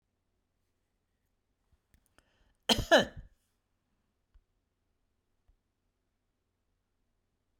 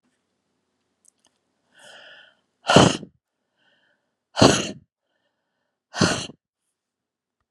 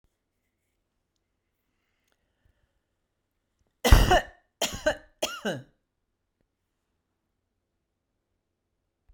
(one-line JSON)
{"cough_length": "7.6 s", "cough_amplitude": 9987, "cough_signal_mean_std_ratio": 0.14, "exhalation_length": "7.5 s", "exhalation_amplitude": 32767, "exhalation_signal_mean_std_ratio": 0.23, "three_cough_length": "9.1 s", "three_cough_amplitude": 28191, "three_cough_signal_mean_std_ratio": 0.19, "survey_phase": "beta (2021-08-13 to 2022-03-07)", "age": "65+", "gender": "Female", "wearing_mask": "No", "symptom_none": true, "smoker_status": "Never smoked", "respiratory_condition_asthma": false, "respiratory_condition_other": false, "recruitment_source": "REACT", "submission_delay": "1 day", "covid_test_result": "Negative", "covid_test_method": "RT-qPCR"}